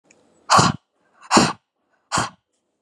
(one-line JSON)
{"exhalation_length": "2.8 s", "exhalation_amplitude": 32678, "exhalation_signal_mean_std_ratio": 0.35, "survey_phase": "beta (2021-08-13 to 2022-03-07)", "age": "18-44", "gender": "Female", "wearing_mask": "No", "symptom_none": true, "smoker_status": "Never smoked", "respiratory_condition_asthma": false, "respiratory_condition_other": false, "recruitment_source": "REACT", "submission_delay": "1 day", "covid_test_result": "Negative", "covid_test_method": "RT-qPCR"}